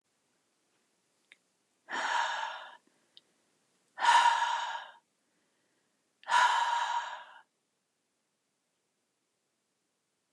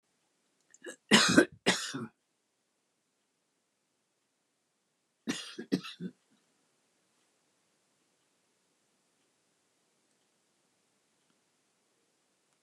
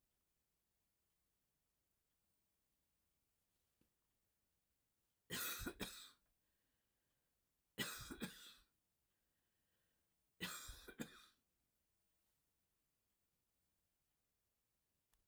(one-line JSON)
{"exhalation_length": "10.3 s", "exhalation_amplitude": 7400, "exhalation_signal_mean_std_ratio": 0.36, "cough_length": "12.6 s", "cough_amplitude": 14631, "cough_signal_mean_std_ratio": 0.19, "three_cough_length": "15.3 s", "three_cough_amplitude": 1032, "three_cough_signal_mean_std_ratio": 0.28, "survey_phase": "alpha (2021-03-01 to 2021-08-12)", "age": "65+", "gender": "Female", "wearing_mask": "No", "symptom_none": true, "smoker_status": "Never smoked", "respiratory_condition_asthma": false, "respiratory_condition_other": false, "recruitment_source": "REACT", "submission_delay": "2 days", "covid_test_result": "Negative", "covid_test_method": "RT-qPCR"}